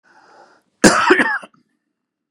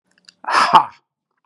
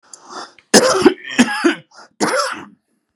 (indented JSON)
{
  "cough_length": "2.3 s",
  "cough_amplitude": 32768,
  "cough_signal_mean_std_ratio": 0.37,
  "exhalation_length": "1.5 s",
  "exhalation_amplitude": 32768,
  "exhalation_signal_mean_std_ratio": 0.37,
  "three_cough_length": "3.2 s",
  "three_cough_amplitude": 32768,
  "three_cough_signal_mean_std_ratio": 0.46,
  "survey_phase": "beta (2021-08-13 to 2022-03-07)",
  "age": "45-64",
  "gender": "Male",
  "wearing_mask": "No",
  "symptom_none": true,
  "smoker_status": "Ex-smoker",
  "respiratory_condition_asthma": false,
  "respiratory_condition_other": false,
  "recruitment_source": "REACT",
  "submission_delay": "1 day",
  "covid_test_result": "Negative",
  "covid_test_method": "RT-qPCR",
  "influenza_a_test_result": "Negative",
  "influenza_b_test_result": "Negative"
}